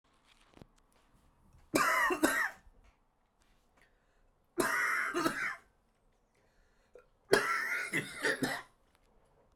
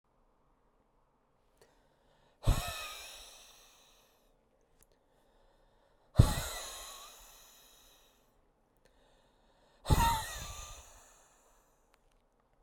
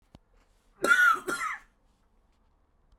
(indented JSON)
{
  "three_cough_length": "9.6 s",
  "three_cough_amplitude": 10245,
  "three_cough_signal_mean_std_ratio": 0.44,
  "exhalation_length": "12.6 s",
  "exhalation_amplitude": 16128,
  "exhalation_signal_mean_std_ratio": 0.24,
  "cough_length": "3.0 s",
  "cough_amplitude": 10349,
  "cough_signal_mean_std_ratio": 0.36,
  "survey_phase": "beta (2021-08-13 to 2022-03-07)",
  "age": "45-64",
  "gender": "Male",
  "wearing_mask": "No",
  "symptom_runny_or_blocked_nose": true,
  "symptom_fatigue": true,
  "symptom_fever_high_temperature": true,
  "symptom_headache": true,
  "symptom_onset": "6 days",
  "smoker_status": "Ex-smoker",
  "respiratory_condition_asthma": true,
  "respiratory_condition_other": false,
  "recruitment_source": "Test and Trace",
  "submission_delay": "1 day",
  "covid_test_result": "Positive",
  "covid_test_method": "RT-qPCR",
  "covid_ct_value": 19.6,
  "covid_ct_gene": "ORF1ab gene",
  "covid_ct_mean": 20.6,
  "covid_viral_load": "180000 copies/ml",
  "covid_viral_load_category": "Low viral load (10K-1M copies/ml)"
}